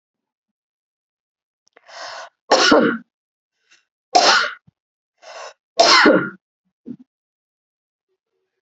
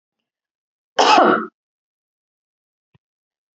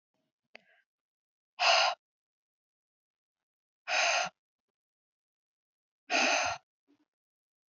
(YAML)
three_cough_length: 8.6 s
three_cough_amplitude: 32397
three_cough_signal_mean_std_ratio: 0.32
cough_length: 3.6 s
cough_amplitude: 31205
cough_signal_mean_std_ratio: 0.28
exhalation_length: 7.7 s
exhalation_amplitude: 6888
exhalation_signal_mean_std_ratio: 0.31
survey_phase: beta (2021-08-13 to 2022-03-07)
age: 45-64
gender: Female
wearing_mask: 'No'
symptom_none: true
smoker_status: Ex-smoker
respiratory_condition_asthma: false
respiratory_condition_other: false
recruitment_source: REACT
submission_delay: 1 day
covid_test_result: Negative
covid_test_method: RT-qPCR